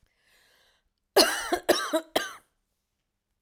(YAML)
cough_length: 3.4 s
cough_amplitude: 21651
cough_signal_mean_std_ratio: 0.33
survey_phase: alpha (2021-03-01 to 2021-08-12)
age: 45-64
gender: Female
wearing_mask: 'No'
symptom_none: true
symptom_fatigue: true
smoker_status: Ex-smoker
respiratory_condition_asthma: false
respiratory_condition_other: false
recruitment_source: REACT
submission_delay: 5 days
covid_test_result: Negative
covid_test_method: RT-qPCR